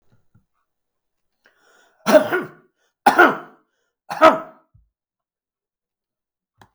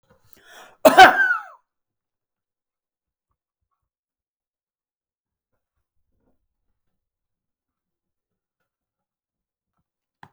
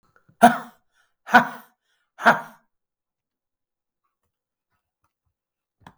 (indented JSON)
{
  "three_cough_length": "6.7 s",
  "three_cough_amplitude": 32768,
  "three_cough_signal_mean_std_ratio": 0.25,
  "cough_length": "10.3 s",
  "cough_amplitude": 32768,
  "cough_signal_mean_std_ratio": 0.15,
  "exhalation_length": "6.0 s",
  "exhalation_amplitude": 32768,
  "exhalation_signal_mean_std_ratio": 0.19,
  "survey_phase": "beta (2021-08-13 to 2022-03-07)",
  "age": "65+",
  "gender": "Male",
  "wearing_mask": "No",
  "symptom_cough_any": true,
  "symptom_runny_or_blocked_nose": true,
  "symptom_fatigue": true,
  "symptom_onset": "12 days",
  "smoker_status": "Never smoked",
  "recruitment_source": "REACT",
  "submission_delay": "3 days",
  "covid_test_result": "Negative",
  "covid_test_method": "RT-qPCR",
  "influenza_a_test_result": "Negative",
  "influenza_b_test_result": "Negative"
}